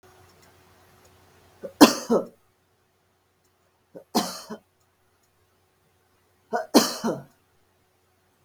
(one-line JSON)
{"three_cough_length": "8.4 s", "three_cough_amplitude": 32768, "three_cough_signal_mean_std_ratio": 0.22, "survey_phase": "beta (2021-08-13 to 2022-03-07)", "age": "65+", "gender": "Female", "wearing_mask": "No", "symptom_none": true, "smoker_status": "Never smoked", "respiratory_condition_asthma": false, "respiratory_condition_other": false, "recruitment_source": "REACT", "submission_delay": "2 days", "covid_test_result": "Negative", "covid_test_method": "RT-qPCR"}